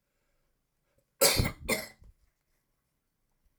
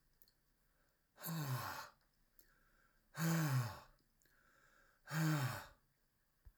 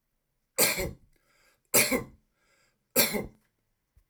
cough_length: 3.6 s
cough_amplitude: 12087
cough_signal_mean_std_ratio: 0.27
exhalation_length: 6.6 s
exhalation_amplitude: 1426
exhalation_signal_mean_std_ratio: 0.45
three_cough_length: 4.1 s
three_cough_amplitude: 14580
three_cough_signal_mean_std_ratio: 0.34
survey_phase: alpha (2021-03-01 to 2021-08-12)
age: 45-64
gender: Male
wearing_mask: 'No'
symptom_none: true
smoker_status: Never smoked
respiratory_condition_asthma: false
respiratory_condition_other: false
recruitment_source: REACT
submission_delay: 1 day
covid_test_result: Negative
covid_test_method: RT-qPCR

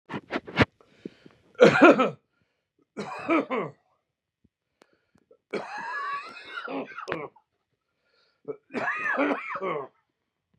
three_cough_length: 10.6 s
three_cough_amplitude: 25041
three_cough_signal_mean_std_ratio: 0.35
survey_phase: beta (2021-08-13 to 2022-03-07)
age: 45-64
gender: Male
wearing_mask: 'No'
symptom_cough_any: true
symptom_shortness_of_breath: true
symptom_fatigue: true
symptom_onset: 12 days
smoker_status: Ex-smoker
respiratory_condition_asthma: false
respiratory_condition_other: false
recruitment_source: REACT
submission_delay: -1 day
covid_test_result: Negative
covid_test_method: RT-qPCR
influenza_a_test_result: Negative
influenza_b_test_result: Negative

